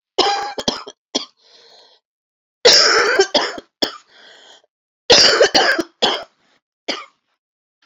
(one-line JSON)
{"three_cough_length": "7.9 s", "three_cough_amplitude": 32768, "three_cough_signal_mean_std_ratio": 0.43, "survey_phase": "beta (2021-08-13 to 2022-03-07)", "age": "45-64", "gender": "Female", "wearing_mask": "No", "symptom_cough_any": true, "symptom_sore_throat": true, "symptom_headache": true, "symptom_onset": "9 days", "smoker_status": "Never smoked", "respiratory_condition_asthma": false, "respiratory_condition_other": false, "recruitment_source": "Test and Trace", "submission_delay": "2 days", "covid_test_result": "Positive", "covid_test_method": "RT-qPCR", "covid_ct_value": 16.1, "covid_ct_gene": "ORF1ab gene", "covid_ct_mean": 16.4, "covid_viral_load": "4100000 copies/ml", "covid_viral_load_category": "High viral load (>1M copies/ml)"}